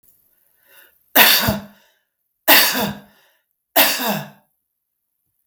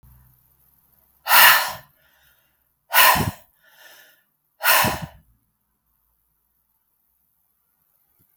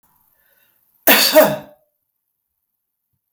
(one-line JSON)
{"three_cough_length": "5.5 s", "three_cough_amplitude": 32768, "three_cough_signal_mean_std_ratio": 0.37, "exhalation_length": "8.4 s", "exhalation_amplitude": 32768, "exhalation_signal_mean_std_ratio": 0.28, "cough_length": "3.3 s", "cough_amplitude": 32768, "cough_signal_mean_std_ratio": 0.3, "survey_phase": "beta (2021-08-13 to 2022-03-07)", "age": "45-64", "gender": "Female", "wearing_mask": "No", "symptom_none": true, "smoker_status": "Ex-smoker", "respiratory_condition_asthma": false, "respiratory_condition_other": false, "recruitment_source": "REACT", "submission_delay": "1 day", "covid_test_result": "Negative", "covid_test_method": "RT-qPCR", "influenza_a_test_result": "Negative", "influenza_b_test_result": "Negative"}